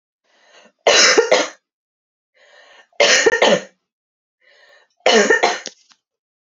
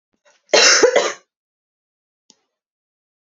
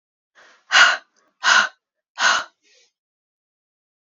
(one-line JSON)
{"three_cough_length": "6.6 s", "three_cough_amplitude": 32767, "three_cough_signal_mean_std_ratio": 0.41, "cough_length": "3.2 s", "cough_amplitude": 32768, "cough_signal_mean_std_ratio": 0.33, "exhalation_length": "4.0 s", "exhalation_amplitude": 29989, "exhalation_signal_mean_std_ratio": 0.33, "survey_phase": "beta (2021-08-13 to 2022-03-07)", "age": "18-44", "gender": "Female", "wearing_mask": "No", "symptom_headache": true, "smoker_status": "Never smoked", "respiratory_condition_asthma": false, "respiratory_condition_other": false, "recruitment_source": "Test and Trace", "submission_delay": "2 days", "covid_test_result": "Positive", "covid_test_method": "RT-qPCR", "covid_ct_value": 19.9, "covid_ct_gene": "N gene"}